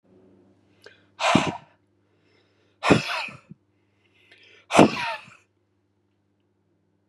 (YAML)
exhalation_length: 7.1 s
exhalation_amplitude: 32498
exhalation_signal_mean_std_ratio: 0.27
survey_phase: beta (2021-08-13 to 2022-03-07)
age: 45-64
gender: Male
wearing_mask: 'No'
symptom_none: true
smoker_status: Never smoked
respiratory_condition_asthma: false
respiratory_condition_other: false
recruitment_source: REACT
submission_delay: 10 days
covid_test_result: Negative
covid_test_method: RT-qPCR
influenza_a_test_result: Unknown/Void
influenza_b_test_result: Unknown/Void